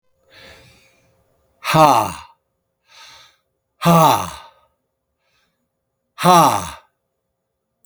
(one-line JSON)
{"exhalation_length": "7.9 s", "exhalation_amplitude": 32768, "exhalation_signal_mean_std_ratio": 0.33, "survey_phase": "beta (2021-08-13 to 2022-03-07)", "age": "65+", "gender": "Male", "wearing_mask": "No", "symptom_none": true, "smoker_status": "Ex-smoker", "respiratory_condition_asthma": false, "respiratory_condition_other": false, "recruitment_source": "REACT", "submission_delay": "1 day", "covid_test_result": "Negative", "covid_test_method": "RT-qPCR"}